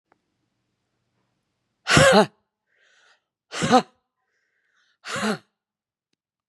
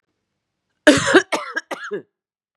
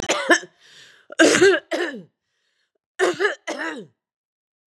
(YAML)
exhalation_length: 6.5 s
exhalation_amplitude: 31552
exhalation_signal_mean_std_ratio: 0.26
cough_length: 2.6 s
cough_amplitude: 32768
cough_signal_mean_std_ratio: 0.34
three_cough_length: 4.7 s
three_cough_amplitude: 30721
three_cough_signal_mean_std_ratio: 0.42
survey_phase: beta (2021-08-13 to 2022-03-07)
age: 45-64
gender: Female
wearing_mask: 'No'
symptom_cough_any: true
symptom_sore_throat: true
symptom_fatigue: true
symptom_onset: 6 days
smoker_status: Ex-smoker
respiratory_condition_asthma: false
respiratory_condition_other: false
recruitment_source: Test and Trace
submission_delay: 2 days
covid_test_result: Positive
covid_test_method: LAMP